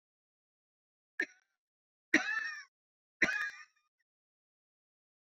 {"three_cough_length": "5.4 s", "three_cough_amplitude": 8777, "three_cough_signal_mean_std_ratio": 0.26, "survey_phase": "beta (2021-08-13 to 2022-03-07)", "age": "45-64", "gender": "Female", "wearing_mask": "No", "symptom_cough_any": true, "symptom_fatigue": true, "symptom_headache": true, "symptom_change_to_sense_of_smell_or_taste": true, "symptom_loss_of_taste": true, "symptom_onset": "5 days", "smoker_status": "Never smoked", "respiratory_condition_asthma": false, "respiratory_condition_other": false, "recruitment_source": "Test and Trace", "submission_delay": "1 day", "covid_test_result": "Positive", "covid_test_method": "RT-qPCR", "covid_ct_value": 19.4, "covid_ct_gene": "ORF1ab gene"}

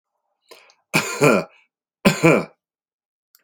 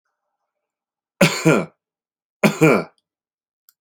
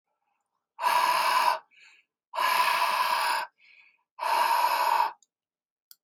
{"cough_length": "3.4 s", "cough_amplitude": 32566, "cough_signal_mean_std_ratio": 0.34, "three_cough_length": "3.8 s", "three_cough_amplitude": 29199, "three_cough_signal_mean_std_ratio": 0.32, "exhalation_length": "6.0 s", "exhalation_amplitude": 9990, "exhalation_signal_mean_std_ratio": 0.63, "survey_phase": "alpha (2021-03-01 to 2021-08-12)", "age": "65+", "gender": "Male", "wearing_mask": "No", "symptom_none": true, "smoker_status": "Never smoked", "respiratory_condition_asthma": false, "respiratory_condition_other": false, "recruitment_source": "REACT", "submission_delay": "2 days", "covid_test_result": "Negative", "covid_test_method": "RT-qPCR"}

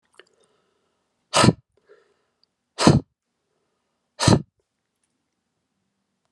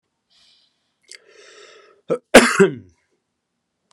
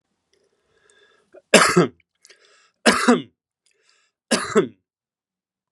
{"exhalation_length": "6.3 s", "exhalation_amplitude": 32746, "exhalation_signal_mean_std_ratio": 0.22, "cough_length": "3.9 s", "cough_amplitude": 32768, "cough_signal_mean_std_ratio": 0.23, "three_cough_length": "5.7 s", "three_cough_amplitude": 32768, "three_cough_signal_mean_std_ratio": 0.29, "survey_phase": "alpha (2021-03-01 to 2021-08-12)", "age": "45-64", "gender": "Male", "wearing_mask": "No", "symptom_none": true, "smoker_status": "Never smoked", "respiratory_condition_asthma": false, "respiratory_condition_other": false, "recruitment_source": "REACT", "submission_delay": "1 day", "covid_test_result": "Negative", "covid_test_method": "RT-qPCR"}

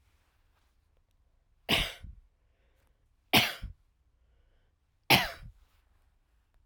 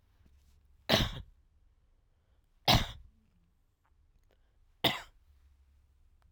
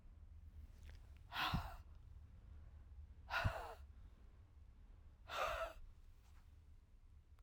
{"three_cough_length": "6.7 s", "three_cough_amplitude": 16083, "three_cough_signal_mean_std_ratio": 0.24, "cough_length": "6.3 s", "cough_amplitude": 10221, "cough_signal_mean_std_ratio": 0.25, "exhalation_length": "7.4 s", "exhalation_amplitude": 1440, "exhalation_signal_mean_std_ratio": 0.56, "survey_phase": "alpha (2021-03-01 to 2021-08-12)", "age": "45-64", "gender": "Female", "wearing_mask": "No", "symptom_cough_any": true, "smoker_status": "Current smoker (11 or more cigarettes per day)", "respiratory_condition_asthma": false, "respiratory_condition_other": false, "recruitment_source": "REACT", "submission_delay": "1 day", "covid_test_result": "Negative", "covid_test_method": "RT-qPCR"}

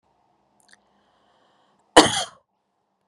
{"cough_length": "3.1 s", "cough_amplitude": 32768, "cough_signal_mean_std_ratio": 0.18, "survey_phase": "beta (2021-08-13 to 2022-03-07)", "age": "45-64", "gender": "Female", "wearing_mask": "No", "symptom_none": true, "symptom_onset": "7 days", "smoker_status": "Ex-smoker", "respiratory_condition_asthma": true, "respiratory_condition_other": false, "recruitment_source": "REACT", "submission_delay": "1 day", "covid_test_result": "Negative", "covid_test_method": "RT-qPCR", "influenza_a_test_result": "Negative", "influenza_b_test_result": "Negative"}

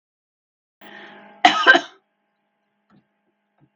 {"cough_length": "3.8 s", "cough_amplitude": 32766, "cough_signal_mean_std_ratio": 0.23, "survey_phase": "beta (2021-08-13 to 2022-03-07)", "age": "45-64", "gender": "Female", "wearing_mask": "No", "symptom_cough_any": true, "symptom_runny_or_blocked_nose": true, "symptom_fatigue": true, "symptom_fever_high_temperature": true, "symptom_change_to_sense_of_smell_or_taste": true, "symptom_onset": "3 days", "smoker_status": "Never smoked", "respiratory_condition_asthma": false, "respiratory_condition_other": false, "recruitment_source": "Test and Trace", "submission_delay": "2 days", "covid_test_result": "Positive", "covid_test_method": "RT-qPCR", "covid_ct_value": 14.8, "covid_ct_gene": "ORF1ab gene", "covid_ct_mean": 15.9, "covid_viral_load": "6000000 copies/ml", "covid_viral_load_category": "High viral load (>1M copies/ml)"}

